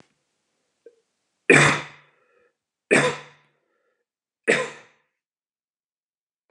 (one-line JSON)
{"three_cough_length": "6.5 s", "three_cough_amplitude": 30649, "three_cough_signal_mean_std_ratio": 0.25, "survey_phase": "beta (2021-08-13 to 2022-03-07)", "age": "45-64", "gender": "Male", "wearing_mask": "No", "symptom_none": true, "symptom_onset": "8 days", "smoker_status": "Never smoked", "respiratory_condition_asthma": false, "respiratory_condition_other": false, "recruitment_source": "REACT", "submission_delay": "1 day", "covid_test_result": "Negative", "covid_test_method": "RT-qPCR", "influenza_a_test_result": "Negative", "influenza_b_test_result": "Negative"}